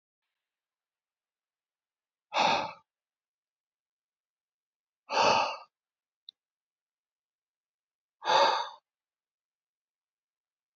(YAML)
exhalation_length: 10.8 s
exhalation_amplitude: 8172
exhalation_signal_mean_std_ratio: 0.26
survey_phase: beta (2021-08-13 to 2022-03-07)
age: 18-44
gender: Male
wearing_mask: 'No'
symptom_none: true
smoker_status: Ex-smoker
respiratory_condition_asthma: false
respiratory_condition_other: false
recruitment_source: REACT
submission_delay: 2 days
covid_test_result: Negative
covid_test_method: RT-qPCR